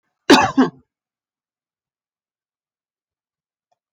{"cough_length": "3.9 s", "cough_amplitude": 30769, "cough_signal_mean_std_ratio": 0.21, "survey_phase": "alpha (2021-03-01 to 2021-08-12)", "age": "65+", "gender": "Female", "wearing_mask": "No", "symptom_none": true, "symptom_cough_any": true, "smoker_status": "Never smoked", "respiratory_condition_asthma": true, "respiratory_condition_other": false, "recruitment_source": "REACT", "submission_delay": "1 day", "covid_test_result": "Negative", "covid_test_method": "RT-qPCR"}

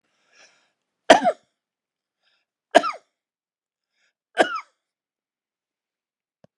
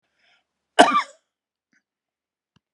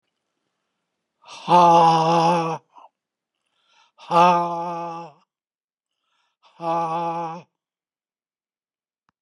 {"three_cough_length": "6.6 s", "three_cough_amplitude": 32768, "three_cough_signal_mean_std_ratio": 0.18, "cough_length": "2.7 s", "cough_amplitude": 32767, "cough_signal_mean_std_ratio": 0.21, "exhalation_length": "9.2 s", "exhalation_amplitude": 25302, "exhalation_signal_mean_std_ratio": 0.4, "survey_phase": "beta (2021-08-13 to 2022-03-07)", "age": "65+", "gender": "Male", "wearing_mask": "No", "symptom_none": true, "smoker_status": "Never smoked", "respiratory_condition_asthma": false, "respiratory_condition_other": false, "recruitment_source": "REACT", "submission_delay": "1 day", "covid_test_result": "Negative", "covid_test_method": "RT-qPCR"}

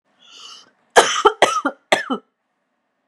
{"three_cough_length": "3.1 s", "three_cough_amplitude": 32768, "three_cough_signal_mean_std_ratio": 0.34, "survey_phase": "beta (2021-08-13 to 2022-03-07)", "age": "18-44", "gender": "Female", "wearing_mask": "No", "symptom_none": true, "smoker_status": "Ex-smoker", "respiratory_condition_asthma": false, "respiratory_condition_other": false, "recruitment_source": "REACT", "submission_delay": "2 days", "covid_test_result": "Negative", "covid_test_method": "RT-qPCR", "influenza_a_test_result": "Negative", "influenza_b_test_result": "Negative"}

